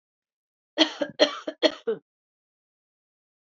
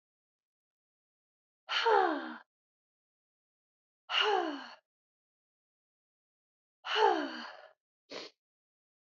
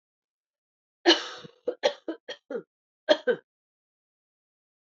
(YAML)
cough_length: 3.6 s
cough_amplitude: 23052
cough_signal_mean_std_ratio: 0.27
exhalation_length: 9.0 s
exhalation_amplitude: 6596
exhalation_signal_mean_std_ratio: 0.32
three_cough_length: 4.9 s
three_cough_amplitude: 17869
three_cough_signal_mean_std_ratio: 0.25
survey_phase: beta (2021-08-13 to 2022-03-07)
age: 45-64
gender: Female
wearing_mask: 'No'
symptom_cough_any: true
symptom_runny_or_blocked_nose: true
symptom_fatigue: true
symptom_fever_high_temperature: true
symptom_change_to_sense_of_smell_or_taste: true
symptom_loss_of_taste: true
smoker_status: Never smoked
respiratory_condition_asthma: false
respiratory_condition_other: false
recruitment_source: Test and Trace
submission_delay: 0 days
covid_test_result: Positive
covid_test_method: LFT